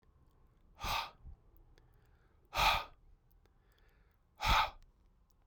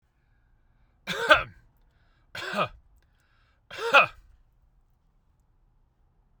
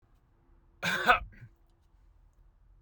{
  "exhalation_length": "5.5 s",
  "exhalation_amplitude": 5075,
  "exhalation_signal_mean_std_ratio": 0.33,
  "three_cough_length": "6.4 s",
  "three_cough_amplitude": 23402,
  "three_cough_signal_mean_std_ratio": 0.24,
  "cough_length": "2.8 s",
  "cough_amplitude": 11849,
  "cough_signal_mean_std_ratio": 0.28,
  "survey_phase": "beta (2021-08-13 to 2022-03-07)",
  "age": "45-64",
  "gender": "Male",
  "wearing_mask": "No",
  "symptom_none": true,
  "smoker_status": "Ex-smoker",
  "respiratory_condition_asthma": false,
  "respiratory_condition_other": false,
  "recruitment_source": "REACT",
  "submission_delay": "2 days",
  "covid_test_result": "Negative",
  "covid_test_method": "RT-qPCR"
}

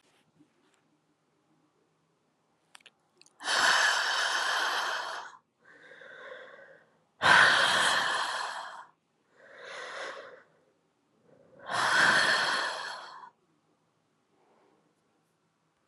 {
  "exhalation_length": "15.9 s",
  "exhalation_amplitude": 13994,
  "exhalation_signal_mean_std_ratio": 0.44,
  "survey_phase": "alpha (2021-03-01 to 2021-08-12)",
  "age": "18-44",
  "gender": "Female",
  "wearing_mask": "No",
  "symptom_cough_any": true,
  "symptom_diarrhoea": true,
  "symptom_fatigue": true,
  "symptom_fever_high_temperature": true,
  "symptom_headache": true,
  "symptom_change_to_sense_of_smell_or_taste": true,
  "symptom_loss_of_taste": true,
  "symptom_onset": "4 days",
  "smoker_status": "Never smoked",
  "respiratory_condition_asthma": false,
  "respiratory_condition_other": false,
  "recruitment_source": "Test and Trace",
  "submission_delay": "1 day",
  "covid_test_result": "Positive",
  "covid_test_method": "RT-qPCR",
  "covid_ct_value": 16.9,
  "covid_ct_gene": "ORF1ab gene",
  "covid_ct_mean": 17.5,
  "covid_viral_load": "1800000 copies/ml",
  "covid_viral_load_category": "High viral load (>1M copies/ml)"
}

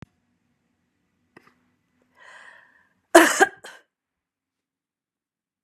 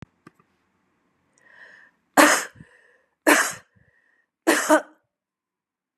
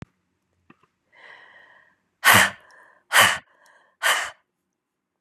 {
  "cough_length": "5.6 s",
  "cough_amplitude": 32767,
  "cough_signal_mean_std_ratio": 0.17,
  "three_cough_length": "6.0 s",
  "three_cough_amplitude": 29969,
  "three_cough_signal_mean_std_ratio": 0.28,
  "exhalation_length": "5.2 s",
  "exhalation_amplitude": 30644,
  "exhalation_signal_mean_std_ratio": 0.29,
  "survey_phase": "beta (2021-08-13 to 2022-03-07)",
  "age": "65+",
  "gender": "Female",
  "wearing_mask": "No",
  "symptom_none": true,
  "symptom_onset": "3 days",
  "smoker_status": "Never smoked",
  "respiratory_condition_asthma": false,
  "respiratory_condition_other": false,
  "recruitment_source": "Test and Trace",
  "submission_delay": "1 day",
  "covid_test_result": "Positive",
  "covid_test_method": "LAMP"
}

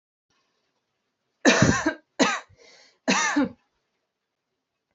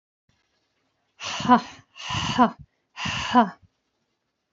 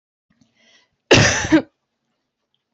{
  "three_cough_length": "4.9 s",
  "three_cough_amplitude": 23604,
  "three_cough_signal_mean_std_ratio": 0.35,
  "exhalation_length": "4.5 s",
  "exhalation_amplitude": 23752,
  "exhalation_signal_mean_std_ratio": 0.35,
  "cough_length": "2.7 s",
  "cough_amplitude": 29158,
  "cough_signal_mean_std_ratio": 0.31,
  "survey_phase": "beta (2021-08-13 to 2022-03-07)",
  "age": "18-44",
  "gender": "Female",
  "wearing_mask": "No",
  "symptom_runny_or_blocked_nose": true,
  "symptom_fatigue": true,
  "symptom_headache": true,
  "symptom_onset": "9 days",
  "smoker_status": "Never smoked",
  "respiratory_condition_asthma": false,
  "respiratory_condition_other": false,
  "recruitment_source": "REACT",
  "submission_delay": "2 days",
  "covid_test_result": "Negative",
  "covid_test_method": "RT-qPCR",
  "influenza_a_test_result": "Negative",
  "influenza_b_test_result": "Negative"
}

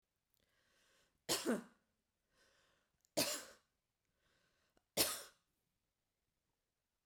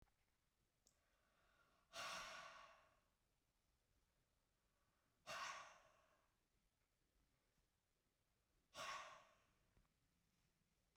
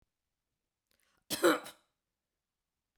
{
  "three_cough_length": "7.1 s",
  "three_cough_amplitude": 3177,
  "three_cough_signal_mean_std_ratio": 0.26,
  "exhalation_length": "11.0 s",
  "exhalation_amplitude": 291,
  "exhalation_signal_mean_std_ratio": 0.36,
  "cough_length": "3.0 s",
  "cough_amplitude": 6029,
  "cough_signal_mean_std_ratio": 0.21,
  "survey_phase": "beta (2021-08-13 to 2022-03-07)",
  "age": "45-64",
  "gender": "Female",
  "wearing_mask": "No",
  "symptom_none": true,
  "symptom_onset": "7 days",
  "smoker_status": "Never smoked",
  "respiratory_condition_asthma": false,
  "respiratory_condition_other": false,
  "recruitment_source": "REACT",
  "submission_delay": "7 days",
  "covid_test_result": "Negative",
  "covid_test_method": "RT-qPCR"
}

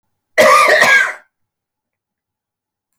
{
  "cough_length": "3.0 s",
  "cough_amplitude": 31760,
  "cough_signal_mean_std_ratio": 0.43,
  "survey_phase": "beta (2021-08-13 to 2022-03-07)",
  "age": "65+",
  "gender": "Male",
  "wearing_mask": "No",
  "symptom_none": true,
  "smoker_status": "Never smoked",
  "respiratory_condition_asthma": false,
  "respiratory_condition_other": false,
  "recruitment_source": "REACT",
  "submission_delay": "2 days",
  "covid_test_result": "Negative",
  "covid_test_method": "RT-qPCR"
}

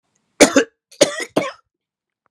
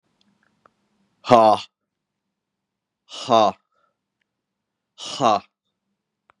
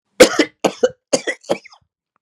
{
  "three_cough_length": "2.3 s",
  "three_cough_amplitude": 32768,
  "three_cough_signal_mean_std_ratio": 0.31,
  "exhalation_length": "6.4 s",
  "exhalation_amplitude": 32767,
  "exhalation_signal_mean_std_ratio": 0.25,
  "cough_length": "2.2 s",
  "cough_amplitude": 32768,
  "cough_signal_mean_std_ratio": 0.33,
  "survey_phase": "beta (2021-08-13 to 2022-03-07)",
  "age": "45-64",
  "gender": "Male",
  "wearing_mask": "No",
  "symptom_cough_any": true,
  "symptom_new_continuous_cough": true,
  "symptom_runny_or_blocked_nose": true,
  "symptom_sore_throat": true,
  "symptom_fatigue": true,
  "symptom_fever_high_temperature": true,
  "symptom_headache": true,
  "symptom_onset": "2 days",
  "smoker_status": "Ex-smoker",
  "respiratory_condition_asthma": false,
  "respiratory_condition_other": false,
  "recruitment_source": "Test and Trace",
  "submission_delay": "1 day",
  "covid_test_result": "Positive",
  "covid_test_method": "RT-qPCR",
  "covid_ct_value": 17.6,
  "covid_ct_gene": "N gene"
}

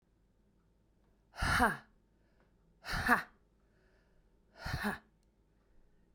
{
  "exhalation_length": "6.1 s",
  "exhalation_amplitude": 8495,
  "exhalation_signal_mean_std_ratio": 0.32,
  "survey_phase": "beta (2021-08-13 to 2022-03-07)",
  "age": "18-44",
  "gender": "Female",
  "wearing_mask": "No",
  "symptom_cough_any": true,
  "symptom_sore_throat": true,
  "symptom_onset": "12 days",
  "smoker_status": "Never smoked",
  "respiratory_condition_asthma": false,
  "respiratory_condition_other": false,
  "recruitment_source": "REACT",
  "submission_delay": "1 day",
  "covid_test_result": "Negative",
  "covid_test_method": "RT-qPCR"
}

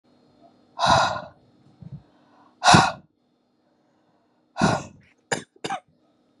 {
  "exhalation_length": "6.4 s",
  "exhalation_amplitude": 30913,
  "exhalation_signal_mean_std_ratio": 0.31,
  "survey_phase": "beta (2021-08-13 to 2022-03-07)",
  "age": "18-44",
  "gender": "Female",
  "wearing_mask": "No",
  "symptom_cough_any": true,
  "symptom_new_continuous_cough": true,
  "symptom_runny_or_blocked_nose": true,
  "symptom_shortness_of_breath": true,
  "symptom_sore_throat": true,
  "symptom_fatigue": true,
  "symptom_headache": true,
  "symptom_onset": "3 days",
  "smoker_status": "Never smoked",
  "respiratory_condition_asthma": true,
  "respiratory_condition_other": false,
  "recruitment_source": "Test and Trace",
  "submission_delay": "1 day",
  "covid_test_result": "Negative",
  "covid_test_method": "RT-qPCR"
}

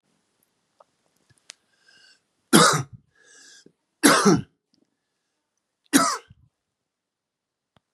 {
  "three_cough_length": "7.9 s",
  "three_cough_amplitude": 31274,
  "three_cough_signal_mean_std_ratio": 0.26,
  "survey_phase": "beta (2021-08-13 to 2022-03-07)",
  "age": "18-44",
  "gender": "Male",
  "wearing_mask": "No",
  "symptom_cough_any": true,
  "symptom_sore_throat": true,
  "symptom_headache": true,
  "symptom_onset": "2 days",
  "smoker_status": "Ex-smoker",
  "respiratory_condition_asthma": false,
  "respiratory_condition_other": false,
  "recruitment_source": "Test and Trace",
  "submission_delay": "0 days",
  "covid_test_result": "Positive",
  "covid_test_method": "RT-qPCR",
  "covid_ct_value": 21.9,
  "covid_ct_gene": "N gene"
}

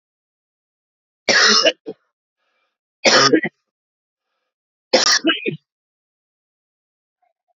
{
  "three_cough_length": "7.6 s",
  "three_cough_amplitude": 32192,
  "three_cough_signal_mean_std_ratio": 0.33,
  "survey_phase": "beta (2021-08-13 to 2022-03-07)",
  "age": "18-44",
  "gender": "Male",
  "wearing_mask": "No",
  "symptom_cough_any": true,
  "symptom_shortness_of_breath": true,
  "symptom_sore_throat": true,
  "symptom_fatigue": true,
  "symptom_headache": true,
  "symptom_change_to_sense_of_smell_or_taste": true,
  "symptom_onset": "4 days",
  "smoker_status": "Current smoker (1 to 10 cigarettes per day)",
  "respiratory_condition_asthma": false,
  "respiratory_condition_other": false,
  "recruitment_source": "Test and Trace",
  "submission_delay": "2 days",
  "covid_test_result": "Positive",
  "covid_test_method": "RT-qPCR",
  "covid_ct_value": 22.4,
  "covid_ct_gene": "N gene"
}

